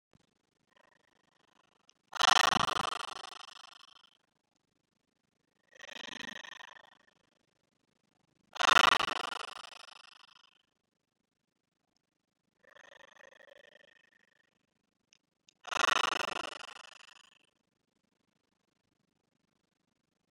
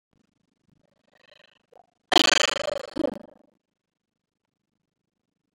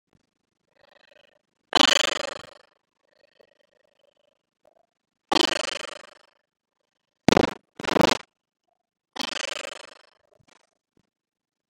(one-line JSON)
{"exhalation_length": "20.3 s", "exhalation_amplitude": 12871, "exhalation_signal_mean_std_ratio": 0.21, "cough_length": "5.5 s", "cough_amplitude": 29656, "cough_signal_mean_std_ratio": 0.22, "three_cough_length": "11.7 s", "three_cough_amplitude": 29502, "three_cough_signal_mean_std_ratio": 0.22, "survey_phase": "beta (2021-08-13 to 2022-03-07)", "age": "18-44", "gender": "Female", "wearing_mask": "No", "symptom_runny_or_blocked_nose": true, "smoker_status": "Never smoked", "respiratory_condition_asthma": false, "respiratory_condition_other": false, "recruitment_source": "REACT", "submission_delay": "4 days", "covid_test_result": "Negative", "covid_test_method": "RT-qPCR", "influenza_a_test_result": "Negative", "influenza_b_test_result": "Negative"}